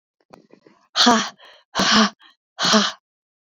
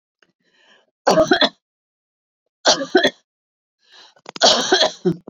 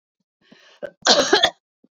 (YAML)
exhalation_length: 3.4 s
exhalation_amplitude: 27714
exhalation_signal_mean_std_ratio: 0.43
three_cough_length: 5.3 s
three_cough_amplitude: 28820
three_cough_signal_mean_std_ratio: 0.38
cough_length: 2.0 s
cough_amplitude: 31433
cough_signal_mean_std_ratio: 0.36
survey_phase: beta (2021-08-13 to 2022-03-07)
age: 45-64
gender: Female
wearing_mask: 'No'
symptom_runny_or_blocked_nose: true
symptom_fatigue: true
symptom_headache: true
symptom_other: true
smoker_status: Never smoked
respiratory_condition_asthma: false
respiratory_condition_other: false
recruitment_source: Test and Trace
submission_delay: 2 days
covid_test_result: Positive
covid_test_method: RT-qPCR
covid_ct_value: 29.5
covid_ct_gene: ORF1ab gene
covid_ct_mean: 30.4
covid_viral_load: 110 copies/ml
covid_viral_load_category: Minimal viral load (< 10K copies/ml)